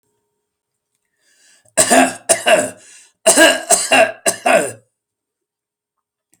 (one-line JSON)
{"cough_length": "6.4 s", "cough_amplitude": 32768, "cough_signal_mean_std_ratio": 0.41, "survey_phase": "alpha (2021-03-01 to 2021-08-12)", "age": "65+", "gender": "Male", "wearing_mask": "No", "symptom_none": true, "smoker_status": "Ex-smoker", "respiratory_condition_asthma": false, "respiratory_condition_other": false, "recruitment_source": "REACT", "submission_delay": "1 day", "covid_test_result": "Negative", "covid_test_method": "RT-qPCR"}